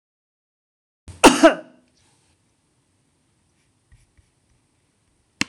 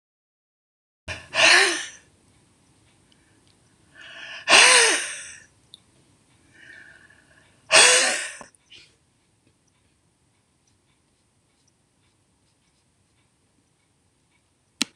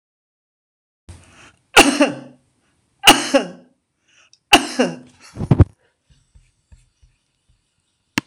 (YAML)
cough_length: 5.5 s
cough_amplitude: 26028
cough_signal_mean_std_ratio: 0.17
exhalation_length: 15.0 s
exhalation_amplitude: 26028
exhalation_signal_mean_std_ratio: 0.27
three_cough_length: 8.3 s
three_cough_amplitude: 26028
three_cough_signal_mean_std_ratio: 0.26
survey_phase: alpha (2021-03-01 to 2021-08-12)
age: 65+
gender: Female
wearing_mask: 'No'
symptom_none: true
smoker_status: Ex-smoker
respiratory_condition_asthma: false
respiratory_condition_other: false
recruitment_source: REACT
submission_delay: 3 days
covid_test_result: Negative
covid_test_method: RT-qPCR